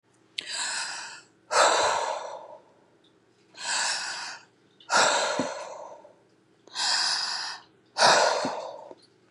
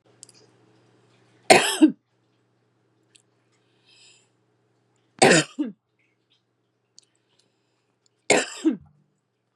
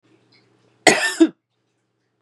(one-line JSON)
{"exhalation_length": "9.3 s", "exhalation_amplitude": 17837, "exhalation_signal_mean_std_ratio": 0.55, "three_cough_length": "9.6 s", "three_cough_amplitude": 32767, "three_cough_signal_mean_std_ratio": 0.23, "cough_length": "2.2 s", "cough_amplitude": 32768, "cough_signal_mean_std_ratio": 0.28, "survey_phase": "beta (2021-08-13 to 2022-03-07)", "age": "45-64", "gender": "Female", "wearing_mask": "No", "symptom_none": true, "smoker_status": "Current smoker (1 to 10 cigarettes per day)", "respiratory_condition_asthma": false, "respiratory_condition_other": false, "recruitment_source": "REACT", "submission_delay": "2 days", "covid_test_result": "Negative", "covid_test_method": "RT-qPCR", "influenza_a_test_result": "Negative", "influenza_b_test_result": "Negative"}